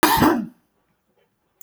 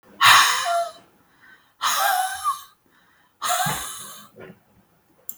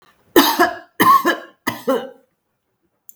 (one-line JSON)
{"cough_length": "1.6 s", "cough_amplitude": 29764, "cough_signal_mean_std_ratio": 0.41, "exhalation_length": "5.4 s", "exhalation_amplitude": 32768, "exhalation_signal_mean_std_ratio": 0.46, "three_cough_length": "3.2 s", "three_cough_amplitude": 32768, "three_cough_signal_mean_std_ratio": 0.43, "survey_phase": "beta (2021-08-13 to 2022-03-07)", "age": "65+", "gender": "Female", "wearing_mask": "No", "symptom_none": true, "smoker_status": "Never smoked", "respiratory_condition_asthma": false, "respiratory_condition_other": false, "recruitment_source": "REACT", "submission_delay": "17 days", "covid_test_result": "Negative", "covid_test_method": "RT-qPCR", "covid_ct_value": 42.0, "covid_ct_gene": "N gene"}